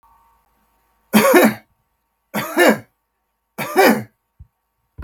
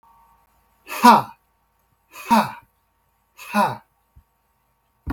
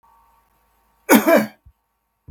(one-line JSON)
{"three_cough_length": "5.0 s", "three_cough_amplitude": 32768, "three_cough_signal_mean_std_ratio": 0.37, "exhalation_length": "5.1 s", "exhalation_amplitude": 32766, "exhalation_signal_mean_std_ratio": 0.27, "cough_length": "2.3 s", "cough_amplitude": 32768, "cough_signal_mean_std_ratio": 0.3, "survey_phase": "beta (2021-08-13 to 2022-03-07)", "age": "65+", "gender": "Male", "wearing_mask": "No", "symptom_none": true, "smoker_status": "Never smoked", "respiratory_condition_asthma": false, "respiratory_condition_other": false, "recruitment_source": "REACT", "submission_delay": "2 days", "covid_test_result": "Negative", "covid_test_method": "RT-qPCR", "influenza_a_test_result": "Negative", "influenza_b_test_result": "Negative"}